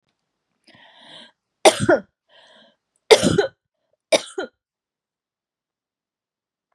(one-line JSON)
{"three_cough_length": "6.7 s", "three_cough_amplitude": 32768, "three_cough_signal_mean_std_ratio": 0.23, "survey_phase": "beta (2021-08-13 to 2022-03-07)", "age": "45-64", "gender": "Female", "wearing_mask": "No", "symptom_cough_any": true, "symptom_sore_throat": true, "symptom_fever_high_temperature": true, "symptom_headache": true, "symptom_other": true, "smoker_status": "Never smoked", "respiratory_condition_asthma": false, "respiratory_condition_other": true, "recruitment_source": "Test and Trace", "submission_delay": "2 days", "covid_test_result": "Positive", "covid_test_method": "LFT"}